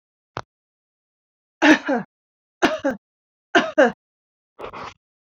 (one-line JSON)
{"three_cough_length": "5.4 s", "three_cough_amplitude": 27261, "three_cough_signal_mean_std_ratio": 0.3, "survey_phase": "beta (2021-08-13 to 2022-03-07)", "age": "45-64", "gender": "Female", "wearing_mask": "No", "symptom_cough_any": true, "symptom_onset": "5 days", "smoker_status": "Never smoked", "respiratory_condition_asthma": false, "respiratory_condition_other": false, "recruitment_source": "REACT", "submission_delay": "1 day", "covid_test_result": "Negative", "covid_test_method": "RT-qPCR"}